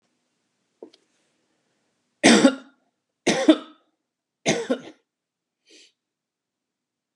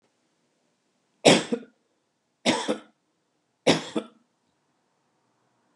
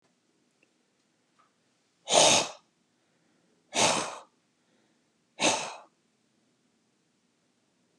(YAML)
cough_length: 7.2 s
cough_amplitude: 28393
cough_signal_mean_std_ratio: 0.25
three_cough_length: 5.8 s
three_cough_amplitude: 25965
three_cough_signal_mean_std_ratio: 0.25
exhalation_length: 8.0 s
exhalation_amplitude: 16830
exhalation_signal_mean_std_ratio: 0.27
survey_phase: alpha (2021-03-01 to 2021-08-12)
age: 65+
gender: Male
wearing_mask: 'No'
symptom_none: true
smoker_status: Never smoked
respiratory_condition_asthma: false
respiratory_condition_other: false
recruitment_source: REACT
submission_delay: 3 days
covid_test_result: Negative
covid_test_method: RT-qPCR